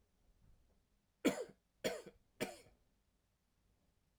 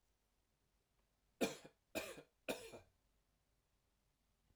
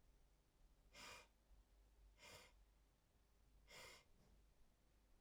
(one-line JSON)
{"cough_length": "4.2 s", "cough_amplitude": 2834, "cough_signal_mean_std_ratio": 0.25, "three_cough_length": "4.6 s", "three_cough_amplitude": 2195, "three_cough_signal_mean_std_ratio": 0.26, "exhalation_length": "5.2 s", "exhalation_amplitude": 124, "exhalation_signal_mean_std_ratio": 0.79, "survey_phase": "alpha (2021-03-01 to 2021-08-12)", "age": "45-64", "gender": "Male", "wearing_mask": "No", "symptom_none": true, "smoker_status": "Never smoked", "respiratory_condition_asthma": false, "respiratory_condition_other": false, "recruitment_source": "REACT", "submission_delay": "7 days", "covid_test_result": "Negative", "covid_test_method": "RT-qPCR"}